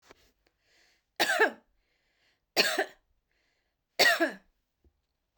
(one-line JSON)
{"three_cough_length": "5.4 s", "three_cough_amplitude": 14420, "three_cough_signal_mean_std_ratio": 0.31, "survey_phase": "beta (2021-08-13 to 2022-03-07)", "age": "45-64", "gender": "Female", "wearing_mask": "No", "symptom_none": true, "smoker_status": "Never smoked", "respiratory_condition_asthma": false, "respiratory_condition_other": false, "recruitment_source": "REACT", "submission_delay": "1 day", "covid_test_result": "Negative", "covid_test_method": "RT-qPCR"}